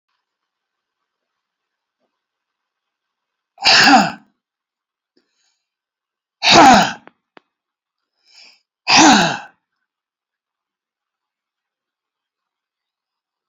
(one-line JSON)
{"exhalation_length": "13.5 s", "exhalation_amplitude": 31350, "exhalation_signal_mean_std_ratio": 0.26, "survey_phase": "beta (2021-08-13 to 2022-03-07)", "age": "45-64", "gender": "Male", "wearing_mask": "No", "symptom_none": true, "smoker_status": "Never smoked", "respiratory_condition_asthma": false, "respiratory_condition_other": false, "recruitment_source": "REACT", "submission_delay": "1 day", "covid_test_result": "Negative", "covid_test_method": "RT-qPCR"}